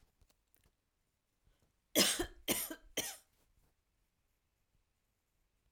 {"three_cough_length": "5.7 s", "three_cough_amplitude": 7026, "three_cough_signal_mean_std_ratio": 0.26, "survey_phase": "alpha (2021-03-01 to 2021-08-12)", "age": "18-44", "gender": "Female", "wearing_mask": "No", "symptom_none": true, "smoker_status": "Ex-smoker", "respiratory_condition_asthma": false, "respiratory_condition_other": false, "recruitment_source": "REACT", "submission_delay": "1 day", "covid_test_result": "Negative", "covid_test_method": "RT-qPCR"}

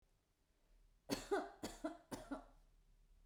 {"three_cough_length": "3.3 s", "three_cough_amplitude": 1696, "three_cough_signal_mean_std_ratio": 0.41, "survey_phase": "beta (2021-08-13 to 2022-03-07)", "age": "45-64", "gender": "Female", "wearing_mask": "No", "symptom_none": true, "smoker_status": "Never smoked", "respiratory_condition_asthma": false, "respiratory_condition_other": false, "recruitment_source": "REACT", "submission_delay": "1 day", "covid_test_result": "Negative", "covid_test_method": "RT-qPCR"}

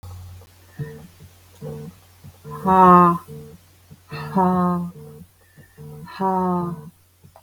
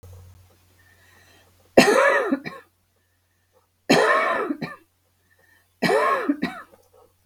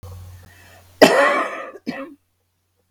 {"exhalation_length": "7.4 s", "exhalation_amplitude": 30162, "exhalation_signal_mean_std_ratio": 0.43, "three_cough_length": "7.3 s", "three_cough_amplitude": 32768, "three_cough_signal_mean_std_ratio": 0.42, "cough_length": "2.9 s", "cough_amplitude": 32768, "cough_signal_mean_std_ratio": 0.37, "survey_phase": "beta (2021-08-13 to 2022-03-07)", "age": "45-64", "gender": "Female", "wearing_mask": "No", "symptom_cough_any": true, "symptom_shortness_of_breath": true, "symptom_fatigue": true, "symptom_onset": "12 days", "smoker_status": "Ex-smoker", "respiratory_condition_asthma": false, "respiratory_condition_other": true, "recruitment_source": "REACT", "submission_delay": "3 days", "covid_test_result": "Negative", "covid_test_method": "RT-qPCR"}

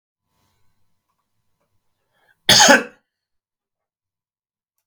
{"cough_length": "4.9 s", "cough_amplitude": 32768, "cough_signal_mean_std_ratio": 0.21, "survey_phase": "beta (2021-08-13 to 2022-03-07)", "age": "45-64", "gender": "Male", "wearing_mask": "No", "symptom_none": true, "smoker_status": "Never smoked", "respiratory_condition_asthma": false, "respiratory_condition_other": false, "recruitment_source": "REACT", "submission_delay": "3 days", "covid_test_result": "Negative", "covid_test_method": "RT-qPCR", "influenza_a_test_result": "Negative", "influenza_b_test_result": "Negative"}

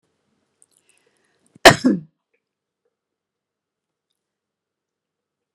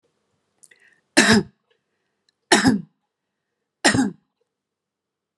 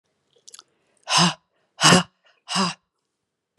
{"cough_length": "5.5 s", "cough_amplitude": 32768, "cough_signal_mean_std_ratio": 0.14, "three_cough_length": "5.4 s", "three_cough_amplitude": 32499, "three_cough_signal_mean_std_ratio": 0.3, "exhalation_length": "3.6 s", "exhalation_amplitude": 30003, "exhalation_signal_mean_std_ratio": 0.32, "survey_phase": "beta (2021-08-13 to 2022-03-07)", "age": "65+", "gender": "Female", "wearing_mask": "No", "symptom_none": true, "smoker_status": "Never smoked", "respiratory_condition_asthma": false, "respiratory_condition_other": false, "recruitment_source": "REACT", "submission_delay": "3 days", "covid_test_result": "Negative", "covid_test_method": "RT-qPCR"}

